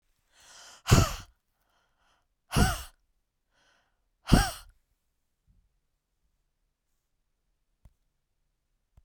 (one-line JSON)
{"exhalation_length": "9.0 s", "exhalation_amplitude": 17593, "exhalation_signal_mean_std_ratio": 0.21, "survey_phase": "beta (2021-08-13 to 2022-03-07)", "age": "45-64", "gender": "Female", "wearing_mask": "No", "symptom_none": true, "smoker_status": "Never smoked", "respiratory_condition_asthma": false, "respiratory_condition_other": false, "recruitment_source": "REACT", "submission_delay": "3 days", "covid_test_result": "Negative", "covid_test_method": "RT-qPCR"}